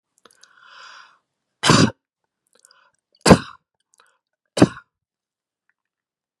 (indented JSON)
{
  "cough_length": "6.4 s",
  "cough_amplitude": 32768,
  "cough_signal_mean_std_ratio": 0.2,
  "survey_phase": "beta (2021-08-13 to 2022-03-07)",
  "age": "45-64",
  "gender": "Female",
  "wearing_mask": "No",
  "symptom_none": true,
  "smoker_status": "Never smoked",
  "respiratory_condition_asthma": false,
  "respiratory_condition_other": true,
  "recruitment_source": "REACT",
  "submission_delay": "2 days",
  "covid_test_result": "Negative",
  "covid_test_method": "RT-qPCR",
  "influenza_a_test_result": "Negative",
  "influenza_b_test_result": "Negative"
}